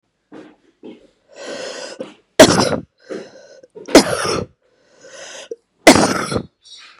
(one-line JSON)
{"three_cough_length": "7.0 s", "three_cough_amplitude": 32768, "three_cough_signal_mean_std_ratio": 0.33, "survey_phase": "beta (2021-08-13 to 2022-03-07)", "age": "18-44", "gender": "Female", "wearing_mask": "No", "symptom_cough_any": true, "symptom_runny_or_blocked_nose": true, "symptom_sore_throat": true, "symptom_fatigue": true, "symptom_headache": true, "symptom_other": true, "smoker_status": "Ex-smoker", "respiratory_condition_asthma": false, "respiratory_condition_other": false, "recruitment_source": "Test and Trace", "submission_delay": "4 days", "covid_test_result": "Positive", "covid_test_method": "LAMP"}